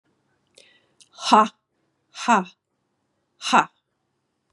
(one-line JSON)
{"exhalation_length": "4.5 s", "exhalation_amplitude": 28809, "exhalation_signal_mean_std_ratio": 0.27, "survey_phase": "beta (2021-08-13 to 2022-03-07)", "age": "45-64", "gender": "Female", "wearing_mask": "No", "symptom_cough_any": true, "symptom_runny_or_blocked_nose": true, "symptom_fatigue": true, "symptom_change_to_sense_of_smell_or_taste": true, "symptom_loss_of_taste": true, "symptom_onset": "3 days", "smoker_status": "Never smoked", "respiratory_condition_asthma": false, "respiratory_condition_other": false, "recruitment_source": "REACT", "submission_delay": "2 days", "covid_test_result": "Positive", "covid_test_method": "RT-qPCR", "covid_ct_value": 19.0, "covid_ct_gene": "E gene", "influenza_a_test_result": "Negative", "influenza_b_test_result": "Negative"}